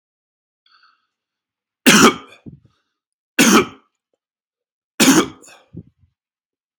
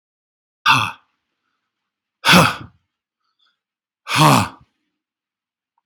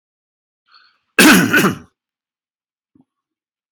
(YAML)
three_cough_length: 6.8 s
three_cough_amplitude: 32767
three_cough_signal_mean_std_ratio: 0.29
exhalation_length: 5.9 s
exhalation_amplitude: 32767
exhalation_signal_mean_std_ratio: 0.3
cough_length: 3.7 s
cough_amplitude: 32767
cough_signal_mean_std_ratio: 0.31
survey_phase: beta (2021-08-13 to 2022-03-07)
age: 45-64
gender: Male
wearing_mask: 'No'
symptom_fatigue: true
symptom_onset: 12 days
smoker_status: Never smoked
respiratory_condition_asthma: false
respiratory_condition_other: false
recruitment_source: REACT
submission_delay: 1 day
covid_test_result: Negative
covid_test_method: RT-qPCR